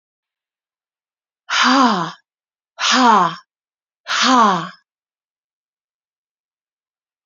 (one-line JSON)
{"exhalation_length": "7.3 s", "exhalation_amplitude": 29284, "exhalation_signal_mean_std_ratio": 0.39, "survey_phase": "beta (2021-08-13 to 2022-03-07)", "age": "18-44", "gender": "Female", "wearing_mask": "No", "symptom_cough_any": true, "symptom_runny_or_blocked_nose": true, "symptom_fatigue": true, "symptom_headache": true, "symptom_change_to_sense_of_smell_or_taste": true, "symptom_loss_of_taste": true, "symptom_onset": "5 days", "smoker_status": "Ex-smoker", "respiratory_condition_asthma": false, "respiratory_condition_other": false, "recruitment_source": "Test and Trace", "submission_delay": "1 day", "covid_test_result": "Positive", "covid_test_method": "RT-qPCR"}